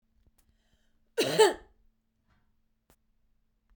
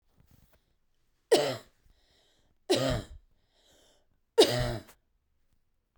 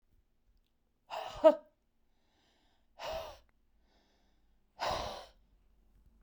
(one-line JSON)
{"cough_length": "3.8 s", "cough_amplitude": 13190, "cough_signal_mean_std_ratio": 0.23, "three_cough_length": "6.0 s", "three_cough_amplitude": 16171, "three_cough_signal_mean_std_ratio": 0.29, "exhalation_length": "6.2 s", "exhalation_amplitude": 9504, "exhalation_signal_mean_std_ratio": 0.22, "survey_phase": "beta (2021-08-13 to 2022-03-07)", "age": "45-64", "gender": "Female", "wearing_mask": "No", "symptom_cough_any": true, "symptom_shortness_of_breath": true, "symptom_fatigue": true, "symptom_change_to_sense_of_smell_or_taste": true, "symptom_onset": "2 days", "smoker_status": "Current smoker (11 or more cigarettes per day)", "respiratory_condition_asthma": true, "respiratory_condition_other": false, "recruitment_source": "REACT", "submission_delay": "2 days", "covid_test_result": "Negative", "covid_test_method": "RT-qPCR"}